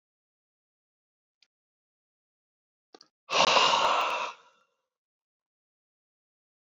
{"exhalation_length": "6.7 s", "exhalation_amplitude": 14081, "exhalation_signal_mean_std_ratio": 0.29, "survey_phase": "beta (2021-08-13 to 2022-03-07)", "age": "65+", "gender": "Male", "wearing_mask": "No", "symptom_cough_any": true, "symptom_runny_or_blocked_nose": true, "symptom_sore_throat": true, "symptom_headache": true, "symptom_other": true, "symptom_onset": "4 days", "smoker_status": "Ex-smoker", "respiratory_condition_asthma": false, "respiratory_condition_other": true, "recruitment_source": "Test and Trace", "submission_delay": "1 day", "covid_test_result": "Positive", "covid_test_method": "RT-qPCR", "covid_ct_value": 17.8, "covid_ct_gene": "ORF1ab gene", "covid_ct_mean": 18.3, "covid_viral_load": "990000 copies/ml", "covid_viral_load_category": "Low viral load (10K-1M copies/ml)"}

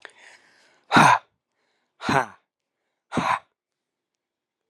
{"exhalation_length": "4.7 s", "exhalation_amplitude": 28283, "exhalation_signal_mean_std_ratio": 0.28, "survey_phase": "alpha (2021-03-01 to 2021-08-12)", "age": "18-44", "gender": "Male", "wearing_mask": "No", "symptom_cough_any": true, "symptom_fatigue": true, "symptom_headache": true, "smoker_status": "Never smoked", "respiratory_condition_asthma": false, "respiratory_condition_other": false, "recruitment_source": "Test and Trace", "submission_delay": "2 days", "covid_test_result": "Positive", "covid_test_method": "RT-qPCR", "covid_ct_value": 14.7, "covid_ct_gene": "ORF1ab gene", "covid_ct_mean": 14.9, "covid_viral_load": "13000000 copies/ml", "covid_viral_load_category": "High viral load (>1M copies/ml)"}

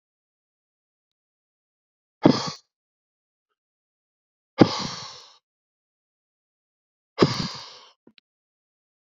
{"exhalation_length": "9.0 s", "exhalation_amplitude": 30267, "exhalation_signal_mean_std_ratio": 0.19, "survey_phase": "beta (2021-08-13 to 2022-03-07)", "age": "45-64", "gender": "Male", "wearing_mask": "No", "symptom_cough_any": true, "symptom_new_continuous_cough": true, "symptom_runny_or_blocked_nose": true, "symptom_fatigue": true, "symptom_headache": true, "symptom_change_to_sense_of_smell_or_taste": true, "symptom_loss_of_taste": true, "symptom_other": true, "symptom_onset": "4 days", "smoker_status": "Ex-smoker", "respiratory_condition_asthma": false, "respiratory_condition_other": false, "recruitment_source": "Test and Trace", "submission_delay": "2 days", "covid_test_result": "Positive", "covid_test_method": "RT-qPCR", "covid_ct_value": 17.3, "covid_ct_gene": "ORF1ab gene", "covid_ct_mean": 17.8, "covid_viral_load": "1400000 copies/ml", "covid_viral_load_category": "High viral load (>1M copies/ml)"}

